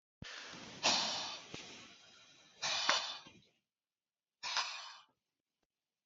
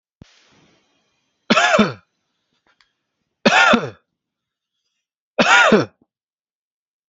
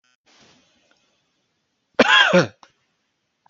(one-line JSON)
{"exhalation_length": "6.1 s", "exhalation_amplitude": 6398, "exhalation_signal_mean_std_ratio": 0.44, "three_cough_length": "7.1 s", "three_cough_amplitude": 29506, "three_cough_signal_mean_std_ratio": 0.34, "cough_length": "3.5 s", "cough_amplitude": 28985, "cough_signal_mean_std_ratio": 0.28, "survey_phase": "beta (2021-08-13 to 2022-03-07)", "age": "18-44", "gender": "Male", "wearing_mask": "No", "symptom_none": true, "symptom_onset": "6 days", "smoker_status": "Prefer not to say", "respiratory_condition_asthma": true, "respiratory_condition_other": false, "recruitment_source": "REACT", "submission_delay": "2 days", "covid_test_result": "Negative", "covid_test_method": "RT-qPCR"}